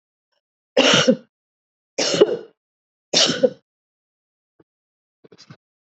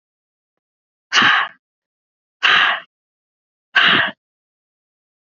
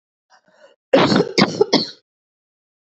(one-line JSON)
{"three_cough_length": "5.9 s", "three_cough_amplitude": 31704, "three_cough_signal_mean_std_ratio": 0.32, "exhalation_length": "5.2 s", "exhalation_amplitude": 30007, "exhalation_signal_mean_std_ratio": 0.36, "cough_length": "2.8 s", "cough_amplitude": 29052, "cough_signal_mean_std_ratio": 0.39, "survey_phase": "beta (2021-08-13 to 2022-03-07)", "age": "45-64", "gender": "Female", "wearing_mask": "No", "symptom_cough_any": true, "symptom_runny_or_blocked_nose": true, "symptom_sore_throat": true, "symptom_headache": true, "symptom_other": true, "symptom_onset": "4 days", "smoker_status": "Ex-smoker", "respiratory_condition_asthma": false, "respiratory_condition_other": false, "recruitment_source": "Test and Trace", "submission_delay": "1 day", "covid_test_result": "Positive", "covid_test_method": "RT-qPCR", "covid_ct_value": 23.8, "covid_ct_gene": "ORF1ab gene", "covid_ct_mean": 23.8, "covid_viral_load": "15000 copies/ml", "covid_viral_load_category": "Low viral load (10K-1M copies/ml)"}